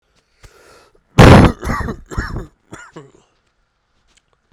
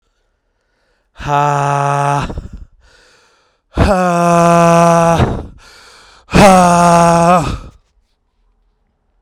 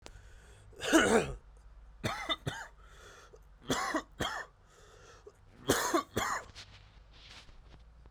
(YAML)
cough_length: 4.5 s
cough_amplitude: 32768
cough_signal_mean_std_ratio: 0.3
exhalation_length: 9.2 s
exhalation_amplitude: 32768
exhalation_signal_mean_std_ratio: 0.57
three_cough_length: 8.1 s
three_cough_amplitude: 8211
three_cough_signal_mean_std_ratio: 0.43
survey_phase: beta (2021-08-13 to 2022-03-07)
age: 18-44
gender: Male
wearing_mask: 'Yes'
symptom_cough_any: true
symptom_runny_or_blocked_nose: true
symptom_shortness_of_breath: true
symptom_abdominal_pain: true
symptom_fever_high_temperature: true
symptom_headache: true
symptom_change_to_sense_of_smell_or_taste: true
symptom_loss_of_taste: true
symptom_onset: 2 days
smoker_status: Ex-smoker
respiratory_condition_asthma: true
respiratory_condition_other: false
recruitment_source: Test and Trace
submission_delay: 1 day
covid_test_result: Positive
covid_test_method: RT-qPCR
covid_ct_value: 11.7
covid_ct_gene: ORF1ab gene
covid_ct_mean: 12.1
covid_viral_load: 110000000 copies/ml
covid_viral_load_category: High viral load (>1M copies/ml)